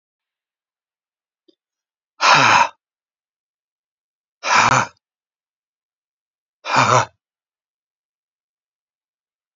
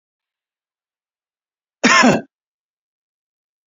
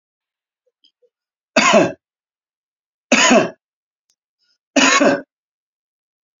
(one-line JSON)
{"exhalation_length": "9.6 s", "exhalation_amplitude": 30751, "exhalation_signal_mean_std_ratio": 0.28, "cough_length": "3.7 s", "cough_amplitude": 32767, "cough_signal_mean_std_ratio": 0.25, "three_cough_length": "6.4 s", "three_cough_amplitude": 30223, "three_cough_signal_mean_std_ratio": 0.34, "survey_phase": "beta (2021-08-13 to 2022-03-07)", "age": "65+", "gender": "Male", "wearing_mask": "No", "symptom_none": true, "smoker_status": "Never smoked", "respiratory_condition_asthma": false, "respiratory_condition_other": false, "recruitment_source": "REACT", "submission_delay": "1 day", "covid_test_result": "Negative", "covid_test_method": "RT-qPCR"}